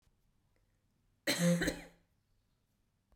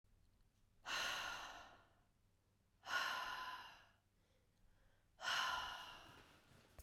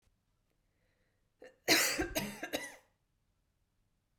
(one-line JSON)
{"cough_length": "3.2 s", "cough_amplitude": 3563, "cough_signal_mean_std_ratio": 0.33, "exhalation_length": "6.8 s", "exhalation_amplitude": 1235, "exhalation_signal_mean_std_ratio": 0.51, "three_cough_length": "4.2 s", "three_cough_amplitude": 7786, "three_cough_signal_mean_std_ratio": 0.32, "survey_phase": "beta (2021-08-13 to 2022-03-07)", "age": "18-44", "gender": "Female", "wearing_mask": "No", "symptom_cough_any": true, "symptom_runny_or_blocked_nose": true, "symptom_fatigue": true, "smoker_status": "Never smoked", "respiratory_condition_asthma": false, "respiratory_condition_other": false, "recruitment_source": "REACT", "submission_delay": "2 days", "covid_test_result": "Negative", "covid_test_method": "RT-qPCR", "influenza_a_test_result": "Negative", "influenza_b_test_result": "Negative"}